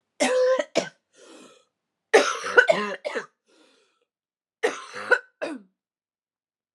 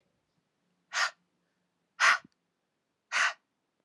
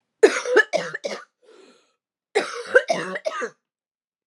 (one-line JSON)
{"three_cough_length": "6.7 s", "three_cough_amplitude": 28099, "three_cough_signal_mean_std_ratio": 0.36, "exhalation_length": "3.8 s", "exhalation_amplitude": 9317, "exhalation_signal_mean_std_ratio": 0.28, "cough_length": "4.3 s", "cough_amplitude": 28027, "cough_signal_mean_std_ratio": 0.37, "survey_phase": "beta (2021-08-13 to 2022-03-07)", "age": "45-64", "gender": "Female", "wearing_mask": "No", "symptom_cough_any": true, "symptom_runny_or_blocked_nose": true, "symptom_fatigue": true, "smoker_status": "Ex-smoker", "respiratory_condition_asthma": false, "respiratory_condition_other": false, "recruitment_source": "Test and Trace", "submission_delay": "2 days", "covid_test_result": "Positive", "covid_test_method": "RT-qPCR", "covid_ct_value": 26.4, "covid_ct_gene": "ORF1ab gene", "covid_ct_mean": 26.8, "covid_viral_load": "1700 copies/ml", "covid_viral_load_category": "Minimal viral load (< 10K copies/ml)"}